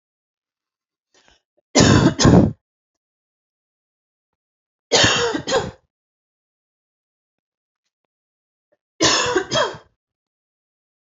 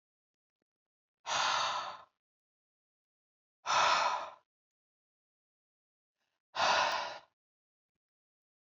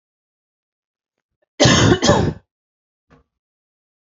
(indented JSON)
{
  "three_cough_length": "11.0 s",
  "three_cough_amplitude": 29572,
  "three_cough_signal_mean_std_ratio": 0.32,
  "exhalation_length": "8.6 s",
  "exhalation_amplitude": 5029,
  "exhalation_signal_mean_std_ratio": 0.36,
  "cough_length": "4.0 s",
  "cough_amplitude": 30125,
  "cough_signal_mean_std_ratio": 0.33,
  "survey_phase": "beta (2021-08-13 to 2022-03-07)",
  "age": "18-44",
  "gender": "Female",
  "wearing_mask": "No",
  "symptom_fatigue": true,
  "symptom_headache": true,
  "symptom_onset": "12 days",
  "smoker_status": "Never smoked",
  "respiratory_condition_asthma": false,
  "respiratory_condition_other": false,
  "recruitment_source": "REACT",
  "submission_delay": "1 day",
  "covid_test_result": "Negative",
  "covid_test_method": "RT-qPCR",
  "influenza_a_test_result": "Negative",
  "influenza_b_test_result": "Negative"
}